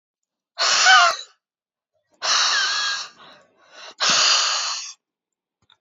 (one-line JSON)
{"exhalation_length": "5.8 s", "exhalation_amplitude": 28317, "exhalation_signal_mean_std_ratio": 0.5, "survey_phase": "alpha (2021-03-01 to 2021-08-12)", "age": "18-44", "gender": "Female", "wearing_mask": "No", "symptom_none": true, "smoker_status": "Never smoked", "respiratory_condition_asthma": false, "respiratory_condition_other": false, "recruitment_source": "REACT", "submission_delay": "2 days", "covid_test_result": "Negative", "covid_test_method": "RT-qPCR"}